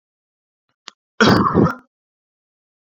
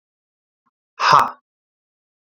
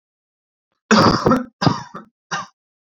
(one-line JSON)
{"cough_length": "2.8 s", "cough_amplitude": 27889, "cough_signal_mean_std_ratio": 0.34, "exhalation_length": "2.2 s", "exhalation_amplitude": 29797, "exhalation_signal_mean_std_ratio": 0.27, "three_cough_length": "3.0 s", "three_cough_amplitude": 28446, "three_cough_signal_mean_std_ratio": 0.39, "survey_phase": "beta (2021-08-13 to 2022-03-07)", "age": "18-44", "gender": "Male", "wearing_mask": "No", "symptom_none": true, "smoker_status": "Ex-smoker", "respiratory_condition_asthma": false, "respiratory_condition_other": false, "recruitment_source": "REACT", "submission_delay": "3 days", "covid_test_result": "Negative", "covid_test_method": "RT-qPCR", "influenza_a_test_result": "Negative", "influenza_b_test_result": "Negative"}